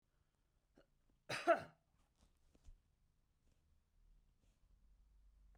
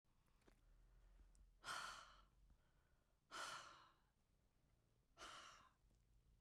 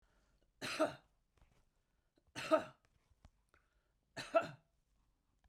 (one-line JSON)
{"cough_length": "5.6 s", "cough_amplitude": 2762, "cough_signal_mean_std_ratio": 0.18, "exhalation_length": "6.4 s", "exhalation_amplitude": 325, "exhalation_signal_mean_std_ratio": 0.49, "three_cough_length": "5.5 s", "three_cough_amplitude": 4002, "three_cough_signal_mean_std_ratio": 0.25, "survey_phase": "beta (2021-08-13 to 2022-03-07)", "age": "65+", "gender": "Female", "wearing_mask": "No", "symptom_none": true, "smoker_status": "Ex-smoker", "respiratory_condition_asthma": false, "respiratory_condition_other": false, "recruitment_source": "REACT", "submission_delay": "2 days", "covid_test_result": "Negative", "covid_test_method": "RT-qPCR", "influenza_a_test_result": "Negative", "influenza_b_test_result": "Negative"}